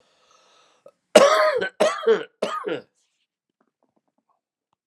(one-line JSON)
{"cough_length": "4.9 s", "cough_amplitude": 32767, "cough_signal_mean_std_ratio": 0.35, "survey_phase": "alpha (2021-03-01 to 2021-08-12)", "age": "45-64", "gender": "Male", "wearing_mask": "No", "symptom_shortness_of_breath": true, "symptom_fever_high_temperature": true, "symptom_onset": "3 days", "smoker_status": "Never smoked", "respiratory_condition_asthma": true, "respiratory_condition_other": true, "recruitment_source": "Test and Trace", "submission_delay": "2 days", "covid_test_result": "Positive", "covid_test_method": "RT-qPCR"}